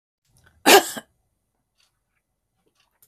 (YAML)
cough_length: 3.1 s
cough_amplitude: 32768
cough_signal_mean_std_ratio: 0.19
survey_phase: beta (2021-08-13 to 2022-03-07)
age: 65+
gender: Female
wearing_mask: 'No'
symptom_cough_any: true
smoker_status: Never smoked
respiratory_condition_asthma: false
respiratory_condition_other: false
recruitment_source: REACT
submission_delay: 6 days
covid_test_result: Negative
covid_test_method: RT-qPCR
influenza_a_test_result: Unknown/Void
influenza_b_test_result: Unknown/Void